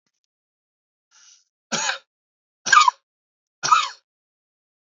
{"cough_length": "4.9 s", "cough_amplitude": 27830, "cough_signal_mean_std_ratio": 0.25, "survey_phase": "beta (2021-08-13 to 2022-03-07)", "age": "18-44", "gender": "Male", "wearing_mask": "No", "symptom_none": true, "smoker_status": "Never smoked", "respiratory_condition_asthma": false, "respiratory_condition_other": false, "recruitment_source": "REACT", "submission_delay": "3 days", "covid_test_result": "Negative", "covid_test_method": "RT-qPCR", "influenza_a_test_result": "Negative", "influenza_b_test_result": "Negative"}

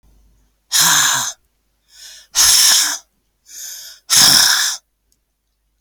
{"exhalation_length": "5.8 s", "exhalation_amplitude": 32768, "exhalation_signal_mean_std_ratio": 0.48, "survey_phase": "alpha (2021-03-01 to 2021-08-12)", "age": "45-64", "gender": "Female", "wearing_mask": "No", "symptom_none": true, "smoker_status": "Ex-smoker", "respiratory_condition_asthma": true, "respiratory_condition_other": false, "recruitment_source": "REACT", "submission_delay": "2 days", "covid_test_result": "Negative", "covid_test_method": "RT-qPCR"}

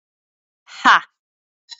{"exhalation_length": "1.8 s", "exhalation_amplitude": 27809, "exhalation_signal_mean_std_ratio": 0.23, "survey_phase": "beta (2021-08-13 to 2022-03-07)", "age": "18-44", "gender": "Female", "wearing_mask": "No", "symptom_none": true, "smoker_status": "Never smoked", "respiratory_condition_asthma": false, "respiratory_condition_other": false, "recruitment_source": "REACT", "submission_delay": "1 day", "covid_test_result": "Negative", "covid_test_method": "RT-qPCR", "influenza_a_test_result": "Negative", "influenza_b_test_result": "Negative"}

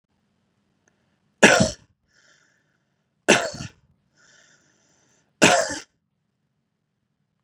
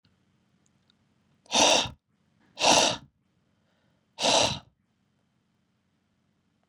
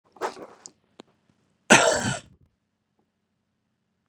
{"three_cough_length": "7.4 s", "three_cough_amplitude": 32111, "three_cough_signal_mean_std_ratio": 0.23, "exhalation_length": "6.7 s", "exhalation_amplitude": 17133, "exhalation_signal_mean_std_ratio": 0.31, "cough_length": "4.1 s", "cough_amplitude": 27451, "cough_signal_mean_std_ratio": 0.24, "survey_phase": "beta (2021-08-13 to 2022-03-07)", "age": "18-44", "gender": "Male", "wearing_mask": "No", "symptom_none": true, "smoker_status": "Never smoked", "respiratory_condition_asthma": false, "respiratory_condition_other": false, "recruitment_source": "REACT", "submission_delay": "2 days", "covid_test_result": "Negative", "covid_test_method": "RT-qPCR", "influenza_a_test_result": "Negative", "influenza_b_test_result": "Negative"}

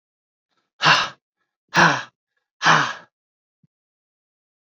{"exhalation_length": "4.6 s", "exhalation_amplitude": 26374, "exhalation_signal_mean_std_ratio": 0.32, "survey_phase": "beta (2021-08-13 to 2022-03-07)", "age": "18-44", "gender": "Male", "wearing_mask": "No", "symptom_cough_any": true, "symptom_runny_or_blocked_nose": true, "symptom_abdominal_pain": true, "symptom_fatigue": true, "symptom_fever_high_temperature": true, "symptom_headache": true, "symptom_change_to_sense_of_smell_or_taste": true, "symptom_loss_of_taste": true, "symptom_onset": "4 days", "smoker_status": "Never smoked", "respiratory_condition_asthma": true, "respiratory_condition_other": false, "recruitment_source": "Test and Trace", "submission_delay": "1 day", "covid_test_result": "Positive", "covid_test_method": "RT-qPCR", "covid_ct_value": 21.8, "covid_ct_gene": "ORF1ab gene", "covid_ct_mean": 22.2, "covid_viral_load": "52000 copies/ml", "covid_viral_load_category": "Low viral load (10K-1M copies/ml)"}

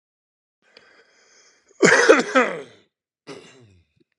{"cough_length": "4.2 s", "cough_amplitude": 32256, "cough_signal_mean_std_ratio": 0.3, "survey_phase": "beta (2021-08-13 to 2022-03-07)", "age": "45-64", "gender": "Male", "wearing_mask": "No", "symptom_cough_any": true, "symptom_runny_or_blocked_nose": true, "symptom_onset": "6 days", "smoker_status": "Never smoked", "respiratory_condition_asthma": false, "respiratory_condition_other": false, "recruitment_source": "REACT", "submission_delay": "2 days", "covid_test_result": "Negative", "covid_test_method": "RT-qPCR", "influenza_a_test_result": "Negative", "influenza_b_test_result": "Negative"}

